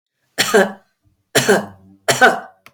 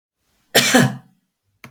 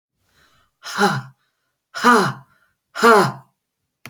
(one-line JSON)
{"three_cough_length": "2.7 s", "three_cough_amplitude": 32767, "three_cough_signal_mean_std_ratio": 0.43, "cough_length": "1.7 s", "cough_amplitude": 32767, "cough_signal_mean_std_ratio": 0.37, "exhalation_length": "4.1 s", "exhalation_amplitude": 28186, "exhalation_signal_mean_std_ratio": 0.37, "survey_phase": "beta (2021-08-13 to 2022-03-07)", "age": "65+", "gender": "Female", "wearing_mask": "No", "symptom_none": true, "smoker_status": "Never smoked", "respiratory_condition_asthma": false, "respiratory_condition_other": false, "recruitment_source": "REACT", "submission_delay": "0 days", "covid_test_result": "Negative", "covid_test_method": "RT-qPCR"}